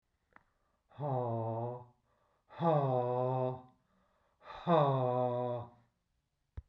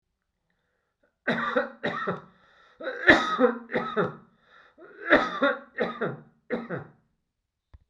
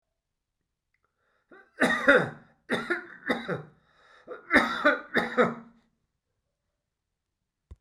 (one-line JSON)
{"exhalation_length": "6.7 s", "exhalation_amplitude": 5110, "exhalation_signal_mean_std_ratio": 0.55, "cough_length": "7.9 s", "cough_amplitude": 22251, "cough_signal_mean_std_ratio": 0.42, "three_cough_length": "7.8 s", "three_cough_amplitude": 17340, "three_cough_signal_mean_std_ratio": 0.35, "survey_phase": "beta (2021-08-13 to 2022-03-07)", "age": "65+", "gender": "Male", "wearing_mask": "No", "symptom_none": true, "smoker_status": "Never smoked", "respiratory_condition_asthma": false, "respiratory_condition_other": false, "recruitment_source": "REACT", "submission_delay": "1 day", "covid_test_result": "Negative", "covid_test_method": "RT-qPCR"}